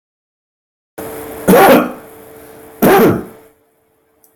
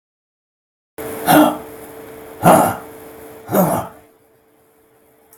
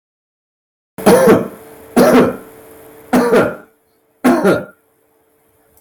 {"cough_length": "4.4 s", "cough_amplitude": 32768, "cough_signal_mean_std_ratio": 0.43, "exhalation_length": "5.4 s", "exhalation_amplitude": 32768, "exhalation_signal_mean_std_ratio": 0.39, "three_cough_length": "5.8 s", "three_cough_amplitude": 32768, "three_cough_signal_mean_std_ratio": 0.46, "survey_phase": "beta (2021-08-13 to 2022-03-07)", "age": "45-64", "gender": "Male", "wearing_mask": "No", "symptom_none": true, "smoker_status": "Ex-smoker", "respiratory_condition_asthma": false, "respiratory_condition_other": false, "recruitment_source": "REACT", "submission_delay": "2 days", "covid_test_result": "Negative", "covid_test_method": "RT-qPCR"}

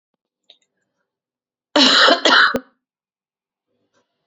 {"cough_length": "4.3 s", "cough_amplitude": 31600, "cough_signal_mean_std_ratio": 0.34, "survey_phase": "beta (2021-08-13 to 2022-03-07)", "age": "45-64", "gender": "Female", "wearing_mask": "No", "symptom_new_continuous_cough": true, "symptom_fatigue": true, "symptom_headache": true, "symptom_onset": "2 days", "smoker_status": "Never smoked", "respiratory_condition_asthma": false, "respiratory_condition_other": false, "recruitment_source": "Test and Trace", "submission_delay": "1 day", "covid_test_result": "Positive", "covid_test_method": "RT-qPCR", "covid_ct_value": 15.8, "covid_ct_gene": "ORF1ab gene", "covid_ct_mean": 15.9, "covid_viral_load": "5900000 copies/ml", "covid_viral_load_category": "High viral load (>1M copies/ml)"}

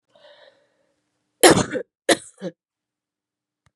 {"cough_length": "3.8 s", "cough_amplitude": 32767, "cough_signal_mean_std_ratio": 0.23, "survey_phase": "beta (2021-08-13 to 2022-03-07)", "age": "45-64", "gender": "Female", "wearing_mask": "No", "symptom_runny_or_blocked_nose": true, "symptom_fatigue": true, "symptom_fever_high_temperature": true, "symptom_onset": "3 days", "smoker_status": "Never smoked", "respiratory_condition_asthma": false, "respiratory_condition_other": false, "recruitment_source": "Test and Trace", "submission_delay": "2 days", "covid_test_result": "Positive", "covid_test_method": "RT-qPCR", "covid_ct_value": 16.8, "covid_ct_gene": "N gene", "covid_ct_mean": 17.8, "covid_viral_load": "1400000 copies/ml", "covid_viral_load_category": "High viral load (>1M copies/ml)"}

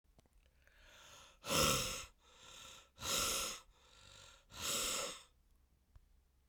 {"exhalation_length": "6.5 s", "exhalation_amplitude": 3787, "exhalation_signal_mean_std_ratio": 0.46, "survey_phase": "beta (2021-08-13 to 2022-03-07)", "age": "65+", "gender": "Female", "wearing_mask": "No", "symptom_cough_any": true, "symptom_new_continuous_cough": true, "symptom_runny_or_blocked_nose": true, "symptom_abdominal_pain": true, "symptom_fatigue": true, "symptom_fever_high_temperature": true, "symptom_headache": true, "symptom_change_to_sense_of_smell_or_taste": true, "symptom_loss_of_taste": true, "symptom_other": true, "smoker_status": "Never smoked", "respiratory_condition_asthma": false, "respiratory_condition_other": false, "recruitment_source": "Test and Trace", "submission_delay": "2 days", "covid_test_result": "Positive", "covid_test_method": "RT-qPCR", "covid_ct_value": 17.7, "covid_ct_gene": "ORF1ab gene", "covid_ct_mean": 18.1, "covid_viral_load": "1200000 copies/ml", "covid_viral_load_category": "High viral load (>1M copies/ml)"}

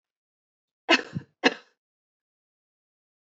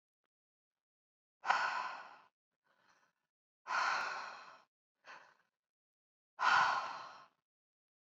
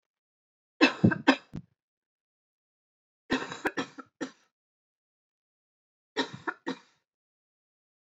{"cough_length": "3.2 s", "cough_amplitude": 18365, "cough_signal_mean_std_ratio": 0.19, "exhalation_length": "8.1 s", "exhalation_amplitude": 5504, "exhalation_signal_mean_std_ratio": 0.36, "three_cough_length": "8.1 s", "three_cough_amplitude": 15198, "three_cough_signal_mean_std_ratio": 0.23, "survey_phase": "beta (2021-08-13 to 2022-03-07)", "age": "18-44", "gender": "Female", "wearing_mask": "No", "symptom_cough_any": true, "symptom_runny_or_blocked_nose": true, "symptom_headache": true, "symptom_other": true, "symptom_onset": "3 days", "smoker_status": "Current smoker (e-cigarettes or vapes only)", "respiratory_condition_asthma": false, "respiratory_condition_other": false, "recruitment_source": "Test and Trace", "submission_delay": "2 days", "covid_test_result": "Positive", "covid_test_method": "RT-qPCR", "covid_ct_value": 18.1, "covid_ct_gene": "ORF1ab gene", "covid_ct_mean": 18.5, "covid_viral_load": "870000 copies/ml", "covid_viral_load_category": "Low viral load (10K-1M copies/ml)"}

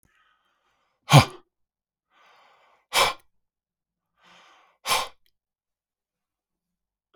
{"exhalation_length": "7.2 s", "exhalation_amplitude": 32539, "exhalation_signal_mean_std_ratio": 0.18, "survey_phase": "beta (2021-08-13 to 2022-03-07)", "age": "65+", "gender": "Male", "wearing_mask": "No", "symptom_none": true, "smoker_status": "Never smoked", "respiratory_condition_asthma": false, "respiratory_condition_other": false, "recruitment_source": "REACT", "submission_delay": "1 day", "covid_test_result": "Negative", "covid_test_method": "RT-qPCR", "influenza_a_test_result": "Unknown/Void", "influenza_b_test_result": "Unknown/Void"}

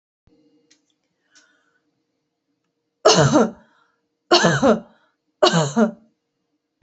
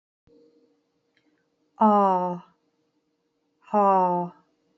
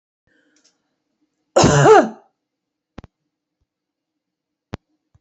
{"three_cough_length": "6.8 s", "three_cough_amplitude": 29572, "three_cough_signal_mean_std_ratio": 0.34, "exhalation_length": "4.8 s", "exhalation_amplitude": 13927, "exhalation_signal_mean_std_ratio": 0.38, "cough_length": "5.2 s", "cough_amplitude": 29159, "cough_signal_mean_std_ratio": 0.26, "survey_phase": "beta (2021-08-13 to 2022-03-07)", "age": "45-64", "gender": "Female", "wearing_mask": "No", "symptom_cough_any": true, "symptom_runny_or_blocked_nose": true, "symptom_onset": "13 days", "smoker_status": "Prefer not to say", "respiratory_condition_asthma": false, "respiratory_condition_other": false, "recruitment_source": "REACT", "submission_delay": "1 day", "covid_test_result": "Negative", "covid_test_method": "RT-qPCR"}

